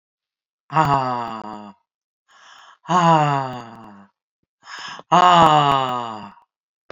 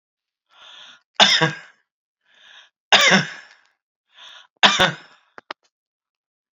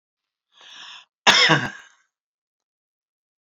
exhalation_length: 6.9 s
exhalation_amplitude: 28698
exhalation_signal_mean_std_ratio: 0.44
three_cough_length: 6.6 s
three_cough_amplitude: 32767
three_cough_signal_mean_std_ratio: 0.3
cough_length: 3.4 s
cough_amplitude: 29006
cough_signal_mean_std_ratio: 0.28
survey_phase: alpha (2021-03-01 to 2021-08-12)
age: 65+
gender: Female
wearing_mask: 'No'
symptom_none: true
smoker_status: Current smoker (1 to 10 cigarettes per day)
respiratory_condition_asthma: false
respiratory_condition_other: false
recruitment_source: REACT
submission_delay: 1 day
covid_test_result: Negative
covid_test_method: RT-qPCR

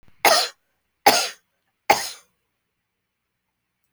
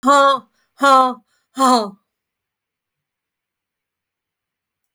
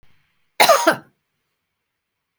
three_cough_length: 3.9 s
three_cough_amplitude: 31911
three_cough_signal_mean_std_ratio: 0.28
exhalation_length: 4.9 s
exhalation_amplitude: 29412
exhalation_signal_mean_std_ratio: 0.35
cough_length: 2.4 s
cough_amplitude: 32768
cough_signal_mean_std_ratio: 0.28
survey_phase: beta (2021-08-13 to 2022-03-07)
age: 65+
gender: Female
wearing_mask: 'No'
symptom_none: true
smoker_status: Never smoked
respiratory_condition_asthma: false
respiratory_condition_other: false
recruitment_source: REACT
submission_delay: 2 days
covid_test_result: Negative
covid_test_method: RT-qPCR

